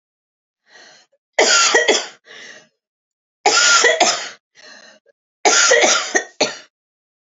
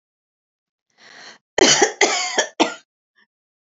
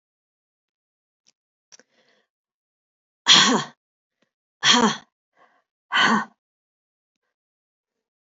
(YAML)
three_cough_length: 7.3 s
three_cough_amplitude: 32767
three_cough_signal_mean_std_ratio: 0.47
cough_length: 3.7 s
cough_amplitude: 32767
cough_signal_mean_std_ratio: 0.36
exhalation_length: 8.4 s
exhalation_amplitude: 28706
exhalation_signal_mean_std_ratio: 0.26
survey_phase: beta (2021-08-13 to 2022-03-07)
age: 65+
gender: Female
wearing_mask: 'No'
symptom_none: true
smoker_status: Never smoked
respiratory_condition_asthma: false
respiratory_condition_other: false
recruitment_source: REACT
submission_delay: 2 days
covid_test_result: Negative
covid_test_method: RT-qPCR
influenza_a_test_result: Negative
influenza_b_test_result: Negative